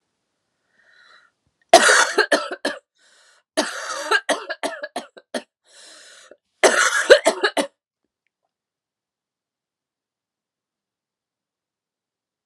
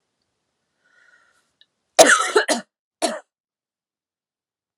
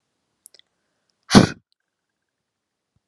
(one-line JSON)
{"cough_length": "12.5 s", "cough_amplitude": 32768, "cough_signal_mean_std_ratio": 0.29, "three_cough_length": "4.8 s", "three_cough_amplitude": 32768, "three_cough_signal_mean_std_ratio": 0.25, "exhalation_length": "3.1 s", "exhalation_amplitude": 32768, "exhalation_signal_mean_std_ratio": 0.16, "survey_phase": "alpha (2021-03-01 to 2021-08-12)", "age": "18-44", "gender": "Female", "wearing_mask": "No", "symptom_cough_any": true, "symptom_fatigue": true, "symptom_fever_high_temperature": true, "symptom_headache": true, "symptom_onset": "5 days", "smoker_status": "Never smoked", "respiratory_condition_asthma": false, "respiratory_condition_other": false, "recruitment_source": "Test and Trace", "submission_delay": "2 days", "covid_test_result": "Positive", "covid_test_method": "RT-qPCR"}